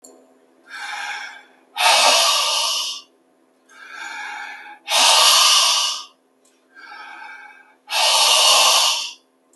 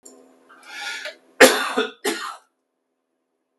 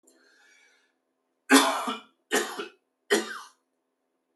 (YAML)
exhalation_length: 9.6 s
exhalation_amplitude: 31263
exhalation_signal_mean_std_ratio: 0.57
cough_length: 3.6 s
cough_amplitude: 32768
cough_signal_mean_std_ratio: 0.3
three_cough_length: 4.4 s
three_cough_amplitude: 19154
three_cough_signal_mean_std_ratio: 0.31
survey_phase: beta (2021-08-13 to 2022-03-07)
age: 18-44
gender: Male
wearing_mask: 'No'
symptom_new_continuous_cough: true
symptom_fatigue: true
symptom_loss_of_taste: true
smoker_status: Never smoked
respiratory_condition_asthma: false
respiratory_condition_other: false
recruitment_source: Test and Trace
submission_delay: 1 day
covid_test_result: Positive
covid_test_method: LFT